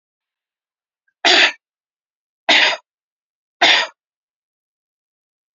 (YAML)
three_cough_length: 5.5 s
three_cough_amplitude: 30238
three_cough_signal_mean_std_ratio: 0.3
survey_phase: beta (2021-08-13 to 2022-03-07)
age: 45-64
gender: Female
wearing_mask: 'No'
symptom_cough_any: true
symptom_runny_or_blocked_nose: true
smoker_status: Never smoked
respiratory_condition_asthma: false
respiratory_condition_other: false
recruitment_source: Test and Trace
submission_delay: 1 day
covid_test_result: Negative
covid_test_method: LFT